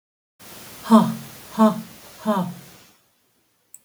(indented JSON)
{
  "exhalation_length": "3.8 s",
  "exhalation_amplitude": 28551,
  "exhalation_signal_mean_std_ratio": 0.35,
  "survey_phase": "beta (2021-08-13 to 2022-03-07)",
  "age": "45-64",
  "gender": "Female",
  "wearing_mask": "No",
  "symptom_none": true,
  "smoker_status": "Current smoker (1 to 10 cigarettes per day)",
  "respiratory_condition_asthma": false,
  "respiratory_condition_other": false,
  "recruitment_source": "REACT",
  "submission_delay": "2 days",
  "covid_test_result": "Negative",
  "covid_test_method": "RT-qPCR",
  "influenza_a_test_result": "Negative",
  "influenza_b_test_result": "Negative"
}